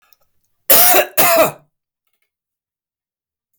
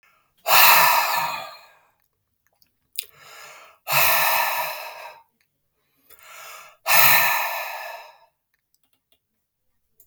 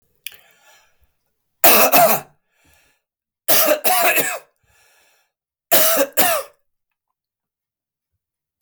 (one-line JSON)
{"cough_length": "3.6 s", "cough_amplitude": 32768, "cough_signal_mean_std_ratio": 0.38, "exhalation_length": "10.1 s", "exhalation_amplitude": 32251, "exhalation_signal_mean_std_ratio": 0.41, "three_cough_length": "8.6 s", "three_cough_amplitude": 32768, "three_cough_signal_mean_std_ratio": 0.4, "survey_phase": "beta (2021-08-13 to 2022-03-07)", "age": "45-64", "gender": "Male", "wearing_mask": "No", "symptom_none": true, "smoker_status": "Never smoked", "respiratory_condition_asthma": false, "respiratory_condition_other": false, "recruitment_source": "REACT", "submission_delay": "6 days", "covid_test_result": "Negative", "covid_test_method": "RT-qPCR"}